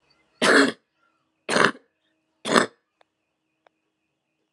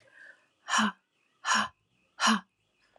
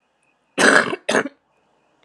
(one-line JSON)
{"three_cough_length": "4.5 s", "three_cough_amplitude": 32767, "three_cough_signal_mean_std_ratio": 0.29, "exhalation_length": "3.0 s", "exhalation_amplitude": 9150, "exhalation_signal_mean_std_ratio": 0.38, "cough_length": "2.0 s", "cough_amplitude": 32767, "cough_signal_mean_std_ratio": 0.37, "survey_phase": "alpha (2021-03-01 to 2021-08-12)", "age": "18-44", "gender": "Female", "wearing_mask": "No", "symptom_cough_any": true, "symptom_headache": true, "symptom_change_to_sense_of_smell_or_taste": true, "symptom_loss_of_taste": true, "symptom_onset": "4 days", "smoker_status": "Never smoked", "respiratory_condition_asthma": false, "respiratory_condition_other": false, "recruitment_source": "Test and Trace", "submission_delay": "2 days", "covid_test_result": "Positive", "covid_test_method": "RT-qPCR", "covid_ct_value": 16.0, "covid_ct_gene": "ORF1ab gene", "covid_ct_mean": 16.3, "covid_viral_load": "4700000 copies/ml", "covid_viral_load_category": "High viral load (>1M copies/ml)"}